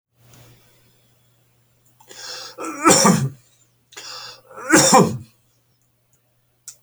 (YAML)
cough_length: 6.8 s
cough_amplitude: 31285
cough_signal_mean_std_ratio: 0.33
survey_phase: beta (2021-08-13 to 2022-03-07)
age: 65+
gender: Male
wearing_mask: 'No'
symptom_none: true
smoker_status: Never smoked
respiratory_condition_asthma: false
respiratory_condition_other: false
recruitment_source: REACT
submission_delay: 0 days
covid_test_result: Negative
covid_test_method: RT-qPCR